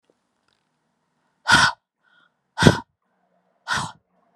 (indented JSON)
{
  "exhalation_length": "4.4 s",
  "exhalation_amplitude": 32768,
  "exhalation_signal_mean_std_ratio": 0.26,
  "survey_phase": "beta (2021-08-13 to 2022-03-07)",
  "age": "18-44",
  "gender": "Female",
  "wearing_mask": "No",
  "symptom_cough_any": true,
  "symptom_new_continuous_cough": true,
  "symptom_runny_or_blocked_nose": true,
  "symptom_shortness_of_breath": true,
  "symptom_sore_throat": true,
  "symptom_fatigue": true,
  "symptom_headache": true,
  "symptom_change_to_sense_of_smell_or_taste": true,
  "smoker_status": "Never smoked",
  "respiratory_condition_asthma": true,
  "respiratory_condition_other": false,
  "recruitment_source": "Test and Trace",
  "submission_delay": "2 days",
  "covid_test_result": "Positive",
  "covid_test_method": "RT-qPCR",
  "covid_ct_value": 21.6,
  "covid_ct_gene": "ORF1ab gene",
  "covid_ct_mean": 22.1,
  "covid_viral_load": "56000 copies/ml",
  "covid_viral_load_category": "Low viral load (10K-1M copies/ml)"
}